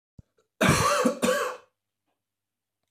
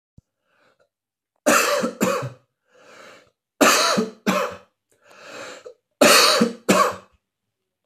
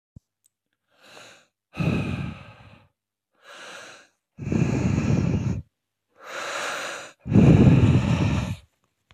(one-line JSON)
{"cough_length": "2.9 s", "cough_amplitude": 14539, "cough_signal_mean_std_ratio": 0.45, "three_cough_length": "7.9 s", "three_cough_amplitude": 29577, "three_cough_signal_mean_std_ratio": 0.43, "exhalation_length": "9.1 s", "exhalation_amplitude": 23135, "exhalation_signal_mean_std_ratio": 0.47, "survey_phase": "beta (2021-08-13 to 2022-03-07)", "age": "45-64", "gender": "Male", "wearing_mask": "No", "symptom_runny_or_blocked_nose": true, "symptom_sore_throat": true, "symptom_fatigue": true, "symptom_headache": true, "symptom_onset": "3 days", "smoker_status": "Never smoked", "respiratory_condition_asthma": false, "respiratory_condition_other": false, "recruitment_source": "REACT", "submission_delay": "1 day", "covid_test_result": "Positive", "covid_test_method": "RT-qPCR", "covid_ct_value": 23.0, "covid_ct_gene": "E gene", "influenza_a_test_result": "Negative", "influenza_b_test_result": "Negative"}